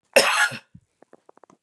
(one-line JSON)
{"cough_length": "1.6 s", "cough_amplitude": 28400, "cough_signal_mean_std_ratio": 0.36, "survey_phase": "beta (2021-08-13 to 2022-03-07)", "age": "45-64", "gender": "Female", "wearing_mask": "No", "symptom_cough_any": true, "symptom_new_continuous_cough": true, "symptom_runny_or_blocked_nose": true, "symptom_sore_throat": true, "symptom_fatigue": true, "symptom_headache": true, "symptom_onset": "2 days", "smoker_status": "Never smoked", "respiratory_condition_asthma": false, "respiratory_condition_other": false, "recruitment_source": "Test and Trace", "submission_delay": "1 day", "covid_test_result": "Negative", "covid_test_method": "RT-qPCR"}